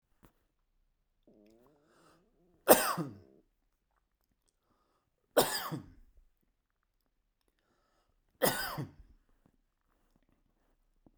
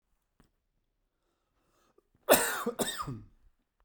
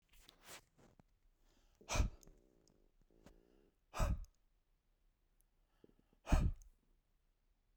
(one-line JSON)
{"three_cough_length": "11.2 s", "three_cough_amplitude": 19875, "three_cough_signal_mean_std_ratio": 0.2, "cough_length": "3.8 s", "cough_amplitude": 15124, "cough_signal_mean_std_ratio": 0.29, "exhalation_length": "7.8 s", "exhalation_amplitude": 3116, "exhalation_signal_mean_std_ratio": 0.26, "survey_phase": "beta (2021-08-13 to 2022-03-07)", "age": "45-64", "gender": "Male", "wearing_mask": "No", "symptom_none": true, "smoker_status": "Never smoked", "respiratory_condition_asthma": false, "respiratory_condition_other": false, "recruitment_source": "REACT", "submission_delay": "1 day", "covid_test_result": "Negative", "covid_test_method": "RT-qPCR"}